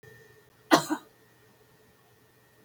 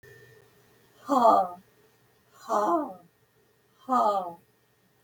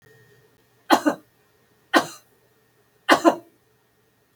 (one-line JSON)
{"cough_length": "2.6 s", "cough_amplitude": 19668, "cough_signal_mean_std_ratio": 0.21, "exhalation_length": "5.0 s", "exhalation_amplitude": 14854, "exhalation_signal_mean_std_ratio": 0.4, "three_cough_length": "4.4 s", "three_cough_amplitude": 31236, "three_cough_signal_mean_std_ratio": 0.26, "survey_phase": "beta (2021-08-13 to 2022-03-07)", "age": "65+", "gender": "Female", "wearing_mask": "No", "symptom_none": true, "smoker_status": "Never smoked", "respiratory_condition_asthma": false, "respiratory_condition_other": false, "recruitment_source": "REACT", "submission_delay": "2 days", "covid_test_result": "Negative", "covid_test_method": "RT-qPCR"}